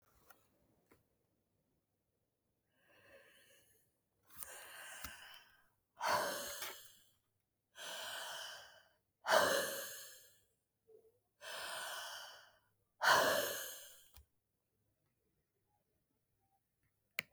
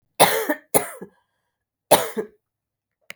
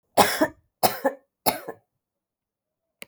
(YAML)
exhalation_length: 17.3 s
exhalation_amplitude: 5108
exhalation_signal_mean_std_ratio: 0.33
cough_length: 3.2 s
cough_amplitude: 32768
cough_signal_mean_std_ratio: 0.32
three_cough_length: 3.1 s
three_cough_amplitude: 28344
three_cough_signal_mean_std_ratio: 0.31
survey_phase: alpha (2021-03-01 to 2021-08-12)
age: 45-64
gender: Female
wearing_mask: 'No'
symptom_cough_any: true
symptom_fatigue: true
symptom_headache: true
symptom_change_to_sense_of_smell_or_taste: true
symptom_loss_of_taste: true
symptom_onset: 2 days
smoker_status: Never smoked
respiratory_condition_asthma: true
respiratory_condition_other: false
recruitment_source: Test and Trace
submission_delay: 1 day
covid_test_result: Positive
covid_test_method: RT-qPCR
covid_ct_value: 11.4
covid_ct_gene: ORF1ab gene
covid_ct_mean: 11.9
covid_viral_load: 130000000 copies/ml
covid_viral_load_category: High viral load (>1M copies/ml)